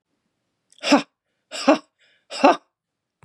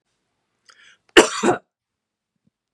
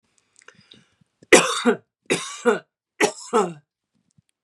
{
  "exhalation_length": "3.2 s",
  "exhalation_amplitude": 31068,
  "exhalation_signal_mean_std_ratio": 0.28,
  "cough_length": "2.7 s",
  "cough_amplitude": 32768,
  "cough_signal_mean_std_ratio": 0.22,
  "three_cough_length": "4.4 s",
  "three_cough_amplitude": 32767,
  "three_cough_signal_mean_std_ratio": 0.33,
  "survey_phase": "beta (2021-08-13 to 2022-03-07)",
  "age": "45-64",
  "gender": "Female",
  "wearing_mask": "No",
  "symptom_fatigue": true,
  "smoker_status": "Ex-smoker",
  "respiratory_condition_asthma": false,
  "respiratory_condition_other": false,
  "recruitment_source": "REACT",
  "submission_delay": "4 days",
  "covid_test_result": "Negative",
  "covid_test_method": "RT-qPCR",
  "influenza_a_test_result": "Negative",
  "influenza_b_test_result": "Negative"
}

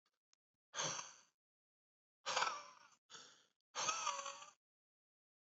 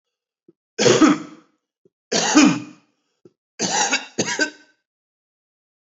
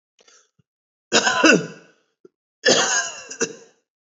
{
  "exhalation_length": "5.5 s",
  "exhalation_amplitude": 2514,
  "exhalation_signal_mean_std_ratio": 0.39,
  "three_cough_length": "6.0 s",
  "three_cough_amplitude": 28564,
  "three_cough_signal_mean_std_ratio": 0.39,
  "cough_length": "4.2 s",
  "cough_amplitude": 32037,
  "cough_signal_mean_std_ratio": 0.39,
  "survey_phase": "alpha (2021-03-01 to 2021-08-12)",
  "age": "18-44",
  "gender": "Male",
  "wearing_mask": "No",
  "symptom_none": true,
  "smoker_status": "Current smoker (11 or more cigarettes per day)",
  "respiratory_condition_asthma": false,
  "respiratory_condition_other": false,
  "recruitment_source": "REACT",
  "submission_delay": "2 days",
  "covid_test_result": "Negative",
  "covid_test_method": "RT-qPCR"
}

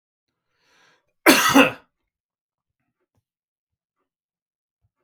{
  "cough_length": "5.0 s",
  "cough_amplitude": 32768,
  "cough_signal_mean_std_ratio": 0.22,
  "survey_phase": "beta (2021-08-13 to 2022-03-07)",
  "age": "45-64",
  "gender": "Male",
  "wearing_mask": "No",
  "symptom_headache": true,
  "symptom_other": true,
  "symptom_onset": "6 days",
  "smoker_status": "Ex-smoker",
  "respiratory_condition_asthma": false,
  "respiratory_condition_other": false,
  "recruitment_source": "REACT",
  "submission_delay": "2 days",
  "covid_test_result": "Negative",
  "covid_test_method": "RT-qPCR",
  "influenza_a_test_result": "Negative",
  "influenza_b_test_result": "Negative"
}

